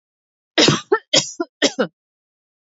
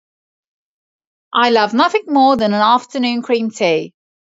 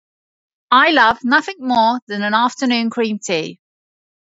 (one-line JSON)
{"three_cough_length": "2.6 s", "three_cough_amplitude": 32767, "three_cough_signal_mean_std_ratio": 0.37, "exhalation_length": "4.3 s", "exhalation_amplitude": 29054, "exhalation_signal_mean_std_ratio": 0.61, "cough_length": "4.4 s", "cough_amplitude": 28428, "cough_signal_mean_std_ratio": 0.6, "survey_phase": "beta (2021-08-13 to 2022-03-07)", "age": "18-44", "gender": "Female", "wearing_mask": "No", "symptom_sore_throat": true, "symptom_onset": "6 days", "smoker_status": "Never smoked", "respiratory_condition_asthma": false, "respiratory_condition_other": false, "recruitment_source": "REACT", "submission_delay": "1 day", "covid_test_result": "Negative", "covid_test_method": "RT-qPCR", "influenza_a_test_result": "Negative", "influenza_b_test_result": "Negative"}